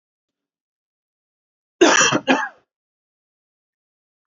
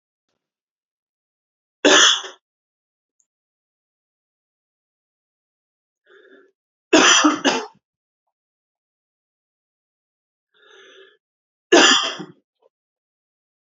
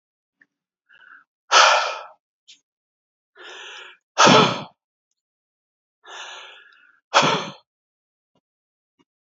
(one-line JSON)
{"cough_length": "4.3 s", "cough_amplitude": 29436, "cough_signal_mean_std_ratio": 0.27, "three_cough_length": "13.7 s", "three_cough_amplitude": 32165, "three_cough_signal_mean_std_ratio": 0.25, "exhalation_length": "9.2 s", "exhalation_amplitude": 29115, "exhalation_signal_mean_std_ratio": 0.28, "survey_phase": "alpha (2021-03-01 to 2021-08-12)", "age": "18-44", "gender": "Male", "wearing_mask": "No", "symptom_none": true, "smoker_status": "Never smoked", "respiratory_condition_asthma": false, "respiratory_condition_other": false, "recruitment_source": "REACT", "submission_delay": "2 days", "covid_test_result": "Negative", "covid_test_method": "RT-qPCR"}